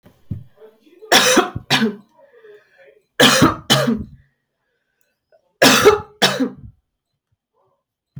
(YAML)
three_cough_length: 8.2 s
three_cough_amplitude: 32768
three_cough_signal_mean_std_ratio: 0.39
survey_phase: alpha (2021-03-01 to 2021-08-12)
age: 18-44
gender: Female
wearing_mask: 'No'
symptom_cough_any: true
symptom_fatigue: true
symptom_fever_high_temperature: true
symptom_onset: 9 days
smoker_status: Never smoked
respiratory_condition_asthma: false
respiratory_condition_other: false
recruitment_source: Test and Trace
submission_delay: 2 days
covid_test_result: Positive
covid_test_method: RT-qPCR
covid_ct_value: 21.3
covid_ct_gene: ORF1ab gene